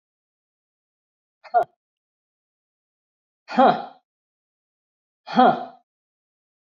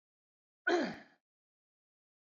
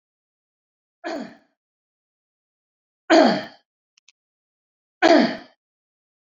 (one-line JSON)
{"exhalation_length": "6.7 s", "exhalation_amplitude": 25944, "exhalation_signal_mean_std_ratio": 0.23, "cough_length": "2.4 s", "cough_amplitude": 3182, "cough_signal_mean_std_ratio": 0.26, "three_cough_length": "6.4 s", "three_cough_amplitude": 26861, "three_cough_signal_mean_std_ratio": 0.25, "survey_phase": "beta (2021-08-13 to 2022-03-07)", "age": "45-64", "gender": "Male", "wearing_mask": "No", "symptom_none": true, "smoker_status": "Never smoked", "respiratory_condition_asthma": false, "respiratory_condition_other": false, "recruitment_source": "REACT", "submission_delay": "6 days", "covid_test_result": "Negative", "covid_test_method": "RT-qPCR"}